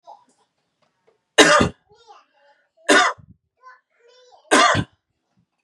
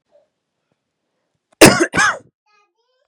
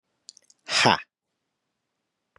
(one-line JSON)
{"three_cough_length": "5.6 s", "three_cough_amplitude": 32768, "three_cough_signal_mean_std_ratio": 0.31, "cough_length": "3.1 s", "cough_amplitude": 32768, "cough_signal_mean_std_ratio": 0.27, "exhalation_length": "2.4 s", "exhalation_amplitude": 20659, "exhalation_signal_mean_std_ratio": 0.25, "survey_phase": "beta (2021-08-13 to 2022-03-07)", "age": "18-44", "gender": "Male", "wearing_mask": "No", "symptom_none": true, "smoker_status": "Never smoked", "respiratory_condition_asthma": false, "respiratory_condition_other": false, "recruitment_source": "REACT", "submission_delay": "1 day", "covid_test_result": "Negative", "covid_test_method": "RT-qPCR", "influenza_a_test_result": "Negative", "influenza_b_test_result": "Negative"}